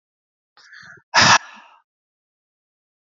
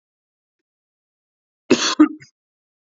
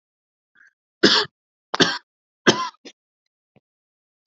{
  "exhalation_length": "3.1 s",
  "exhalation_amplitude": 29605,
  "exhalation_signal_mean_std_ratio": 0.24,
  "cough_length": "2.9 s",
  "cough_amplitude": 28197,
  "cough_signal_mean_std_ratio": 0.23,
  "three_cough_length": "4.3 s",
  "three_cough_amplitude": 28754,
  "three_cough_signal_mean_std_ratio": 0.26,
  "survey_phase": "beta (2021-08-13 to 2022-03-07)",
  "age": "18-44",
  "gender": "Male",
  "wearing_mask": "No",
  "symptom_headache": true,
  "symptom_onset": "12 days",
  "smoker_status": "Never smoked",
  "respiratory_condition_asthma": false,
  "respiratory_condition_other": false,
  "recruitment_source": "REACT",
  "submission_delay": "1 day",
  "covid_test_result": "Negative",
  "covid_test_method": "RT-qPCR",
  "influenza_a_test_result": "Negative",
  "influenza_b_test_result": "Negative"
}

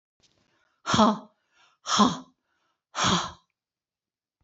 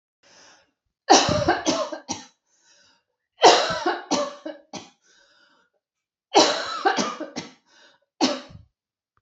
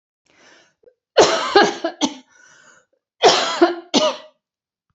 {
  "exhalation_length": "4.4 s",
  "exhalation_amplitude": 20798,
  "exhalation_signal_mean_std_ratio": 0.34,
  "three_cough_length": "9.2 s",
  "three_cough_amplitude": 27711,
  "three_cough_signal_mean_std_ratio": 0.38,
  "cough_length": "4.9 s",
  "cough_amplitude": 31838,
  "cough_signal_mean_std_ratio": 0.4,
  "survey_phase": "beta (2021-08-13 to 2022-03-07)",
  "age": "45-64",
  "gender": "Female",
  "wearing_mask": "No",
  "symptom_cough_any": true,
  "smoker_status": "Never smoked",
  "respiratory_condition_asthma": true,
  "respiratory_condition_other": false,
  "recruitment_source": "Test and Trace",
  "submission_delay": "1 day",
  "covid_test_result": "Negative",
  "covid_test_method": "RT-qPCR"
}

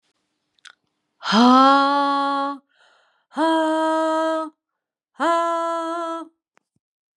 {
  "exhalation_length": "7.2 s",
  "exhalation_amplitude": 27656,
  "exhalation_signal_mean_std_ratio": 0.55,
  "survey_phase": "beta (2021-08-13 to 2022-03-07)",
  "age": "45-64",
  "gender": "Female",
  "wearing_mask": "No",
  "symptom_cough_any": true,
  "symptom_runny_or_blocked_nose": true,
  "symptom_sore_throat": true,
  "symptom_fatigue": true,
  "symptom_fever_high_temperature": true,
  "symptom_headache": true,
  "smoker_status": "Ex-smoker",
  "respiratory_condition_asthma": false,
  "respiratory_condition_other": false,
  "recruitment_source": "Test and Trace",
  "submission_delay": "2 days",
  "covid_test_result": "Positive",
  "covid_test_method": "RT-qPCR",
  "covid_ct_value": 25.0,
  "covid_ct_gene": "ORF1ab gene",
  "covid_ct_mean": 25.5,
  "covid_viral_load": "4400 copies/ml",
  "covid_viral_load_category": "Minimal viral load (< 10K copies/ml)"
}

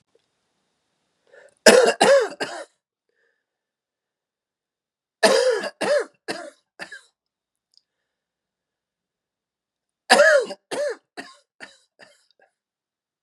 {
  "three_cough_length": "13.2 s",
  "three_cough_amplitude": 32768,
  "three_cough_signal_mean_std_ratio": 0.29,
  "survey_phase": "beta (2021-08-13 to 2022-03-07)",
  "age": "18-44",
  "gender": "Male",
  "wearing_mask": "No",
  "symptom_cough_any": true,
  "symptom_runny_or_blocked_nose": true,
  "symptom_fatigue": true,
  "symptom_headache": true,
  "smoker_status": "Current smoker (11 or more cigarettes per day)",
  "respiratory_condition_asthma": false,
  "respiratory_condition_other": false,
  "recruitment_source": "Test and Trace",
  "submission_delay": "2 days",
  "covid_test_result": "Negative",
  "covid_test_method": "RT-qPCR"
}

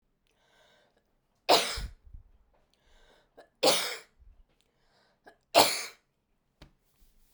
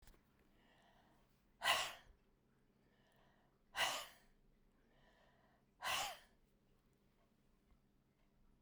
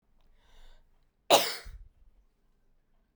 {
  "three_cough_length": "7.3 s",
  "three_cough_amplitude": 18939,
  "three_cough_signal_mean_std_ratio": 0.26,
  "exhalation_length": "8.6 s",
  "exhalation_amplitude": 3498,
  "exhalation_signal_mean_std_ratio": 0.29,
  "cough_length": "3.2 s",
  "cough_amplitude": 14302,
  "cough_signal_mean_std_ratio": 0.23,
  "survey_phase": "beta (2021-08-13 to 2022-03-07)",
  "age": "45-64",
  "gender": "Female",
  "wearing_mask": "No",
  "symptom_none": true,
  "smoker_status": "Never smoked",
  "respiratory_condition_asthma": true,
  "respiratory_condition_other": false,
  "recruitment_source": "REACT",
  "submission_delay": "2 days",
  "covid_test_result": "Negative",
  "covid_test_method": "RT-qPCR"
}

